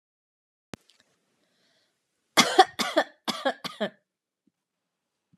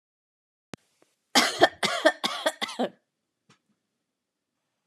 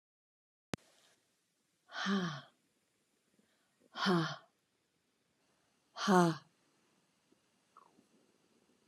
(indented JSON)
{
  "three_cough_length": "5.4 s",
  "three_cough_amplitude": 24216,
  "three_cough_signal_mean_std_ratio": 0.24,
  "cough_length": "4.9 s",
  "cough_amplitude": 20318,
  "cough_signal_mean_std_ratio": 0.3,
  "exhalation_length": "8.9 s",
  "exhalation_amplitude": 6715,
  "exhalation_signal_mean_std_ratio": 0.27,
  "survey_phase": "alpha (2021-03-01 to 2021-08-12)",
  "age": "45-64",
  "gender": "Female",
  "wearing_mask": "No",
  "symptom_headache": true,
  "symptom_onset": "12 days",
  "smoker_status": "Never smoked",
  "respiratory_condition_asthma": false,
  "respiratory_condition_other": false,
  "recruitment_source": "REACT",
  "submission_delay": "32 days",
  "covid_test_result": "Negative",
  "covid_test_method": "RT-qPCR"
}